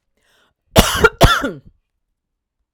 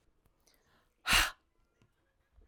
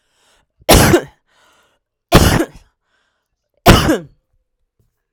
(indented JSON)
{
  "cough_length": "2.7 s",
  "cough_amplitude": 32768,
  "cough_signal_mean_std_ratio": 0.33,
  "exhalation_length": "2.5 s",
  "exhalation_amplitude": 7163,
  "exhalation_signal_mean_std_ratio": 0.25,
  "three_cough_length": "5.1 s",
  "three_cough_amplitude": 32768,
  "three_cough_signal_mean_std_ratio": 0.34,
  "survey_phase": "alpha (2021-03-01 to 2021-08-12)",
  "age": "45-64",
  "gender": "Female",
  "wearing_mask": "No",
  "symptom_none": true,
  "smoker_status": "Ex-smoker",
  "respiratory_condition_asthma": true,
  "respiratory_condition_other": false,
  "recruitment_source": "REACT",
  "submission_delay": "1 day",
  "covid_test_result": "Negative",
  "covid_test_method": "RT-qPCR"
}